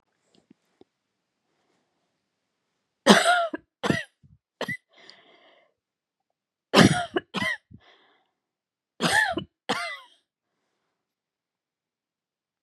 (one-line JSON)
{"three_cough_length": "12.6 s", "three_cough_amplitude": 32767, "three_cough_signal_mean_std_ratio": 0.26, "survey_phase": "beta (2021-08-13 to 2022-03-07)", "age": "45-64", "gender": "Female", "wearing_mask": "No", "symptom_none": true, "smoker_status": "Never smoked", "respiratory_condition_asthma": true, "respiratory_condition_other": false, "recruitment_source": "REACT", "submission_delay": "2 days", "covid_test_result": "Negative", "covid_test_method": "RT-qPCR"}